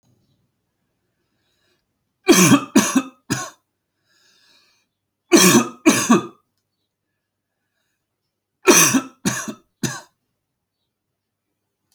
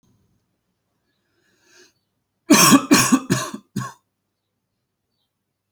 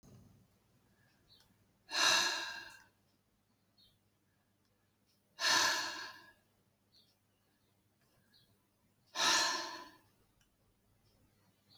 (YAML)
three_cough_length: 11.9 s
three_cough_amplitude: 32010
three_cough_signal_mean_std_ratio: 0.31
cough_length: 5.7 s
cough_amplitude: 32597
cough_signal_mean_std_ratio: 0.29
exhalation_length: 11.8 s
exhalation_amplitude: 4222
exhalation_signal_mean_std_ratio: 0.32
survey_phase: alpha (2021-03-01 to 2021-08-12)
age: 45-64
gender: Male
wearing_mask: 'No'
symptom_none: true
smoker_status: Never smoked
respiratory_condition_asthma: false
respiratory_condition_other: false
recruitment_source: REACT
submission_delay: 3 days
covid_test_result: Negative
covid_test_method: RT-qPCR